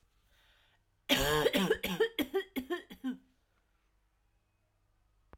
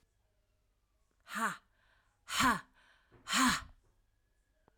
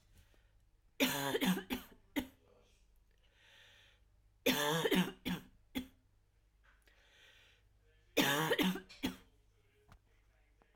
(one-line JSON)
{"cough_length": "5.4 s", "cough_amplitude": 6856, "cough_signal_mean_std_ratio": 0.41, "exhalation_length": "4.8 s", "exhalation_amplitude": 4589, "exhalation_signal_mean_std_ratio": 0.33, "three_cough_length": "10.8 s", "three_cough_amplitude": 4228, "three_cough_signal_mean_std_ratio": 0.39, "survey_phase": "alpha (2021-03-01 to 2021-08-12)", "age": "45-64", "gender": "Female", "wearing_mask": "No", "symptom_fatigue": true, "symptom_headache": true, "symptom_change_to_sense_of_smell_or_taste": true, "symptom_loss_of_taste": true, "symptom_onset": "3 days", "smoker_status": "Never smoked", "respiratory_condition_asthma": false, "respiratory_condition_other": false, "recruitment_source": "Test and Trace", "submission_delay": "1 day", "covid_test_result": "Positive", "covid_test_method": "RT-qPCR", "covid_ct_value": 13.5, "covid_ct_gene": "ORF1ab gene", "covid_ct_mean": 14.1, "covid_viral_load": "24000000 copies/ml", "covid_viral_load_category": "High viral load (>1M copies/ml)"}